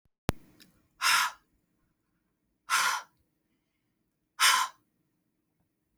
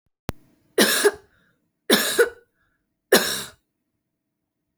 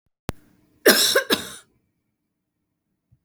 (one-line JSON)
{"exhalation_length": "6.0 s", "exhalation_amplitude": 13262, "exhalation_signal_mean_std_ratio": 0.31, "three_cough_length": "4.8 s", "three_cough_amplitude": 29090, "three_cough_signal_mean_std_ratio": 0.34, "cough_length": "3.2 s", "cough_amplitude": 32767, "cough_signal_mean_std_ratio": 0.3, "survey_phase": "alpha (2021-03-01 to 2021-08-12)", "age": "45-64", "gender": "Female", "wearing_mask": "No", "symptom_none": true, "smoker_status": "Never smoked", "respiratory_condition_asthma": false, "respiratory_condition_other": false, "recruitment_source": "REACT", "submission_delay": "1 day", "covid_test_result": "Negative", "covid_test_method": "RT-qPCR"}